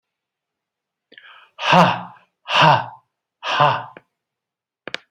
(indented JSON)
{
  "exhalation_length": "5.1 s",
  "exhalation_amplitude": 29931,
  "exhalation_signal_mean_std_ratio": 0.36,
  "survey_phase": "beta (2021-08-13 to 2022-03-07)",
  "age": "65+",
  "gender": "Male",
  "wearing_mask": "No",
  "symptom_none": true,
  "smoker_status": "Never smoked",
  "respiratory_condition_asthma": false,
  "respiratory_condition_other": false,
  "recruitment_source": "REACT",
  "submission_delay": "2 days",
  "covid_test_result": "Negative",
  "covid_test_method": "RT-qPCR",
  "influenza_a_test_result": "Negative",
  "influenza_b_test_result": "Negative"
}